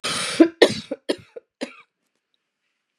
{"cough_length": "3.0 s", "cough_amplitude": 32767, "cough_signal_mean_std_ratio": 0.29, "survey_phase": "beta (2021-08-13 to 2022-03-07)", "age": "45-64", "gender": "Female", "wearing_mask": "No", "symptom_sore_throat": true, "symptom_fatigue": true, "symptom_headache": true, "symptom_other": true, "smoker_status": "Never smoked", "respiratory_condition_asthma": false, "respiratory_condition_other": false, "recruitment_source": "Test and Trace", "submission_delay": "1 day", "covid_test_result": "Positive", "covid_test_method": "RT-qPCR", "covid_ct_value": 38.5, "covid_ct_gene": "N gene"}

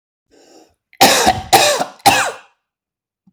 {"three_cough_length": "3.3 s", "three_cough_amplitude": 32768, "three_cough_signal_mean_std_ratio": 0.44, "survey_phase": "beta (2021-08-13 to 2022-03-07)", "age": "18-44", "gender": "Male", "wearing_mask": "No", "symptom_none": true, "smoker_status": "Never smoked", "respiratory_condition_asthma": false, "respiratory_condition_other": false, "recruitment_source": "REACT", "submission_delay": "1 day", "covid_test_result": "Negative", "covid_test_method": "RT-qPCR", "influenza_a_test_result": "Unknown/Void", "influenza_b_test_result": "Unknown/Void"}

